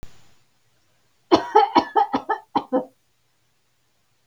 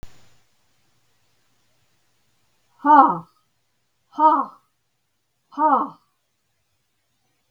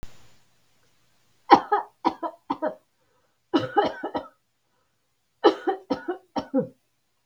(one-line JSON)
{"cough_length": "4.3 s", "cough_amplitude": 30367, "cough_signal_mean_std_ratio": 0.33, "exhalation_length": "7.5 s", "exhalation_amplitude": 32768, "exhalation_signal_mean_std_ratio": 0.27, "three_cough_length": "7.3 s", "three_cough_amplitude": 32768, "three_cough_signal_mean_std_ratio": 0.31, "survey_phase": "beta (2021-08-13 to 2022-03-07)", "age": "65+", "gender": "Female", "wearing_mask": "No", "symptom_none": true, "smoker_status": "Never smoked", "respiratory_condition_asthma": true, "respiratory_condition_other": false, "recruitment_source": "REACT", "submission_delay": "5 days", "covid_test_result": "Negative", "covid_test_method": "RT-qPCR", "influenza_a_test_result": "Negative", "influenza_b_test_result": "Negative"}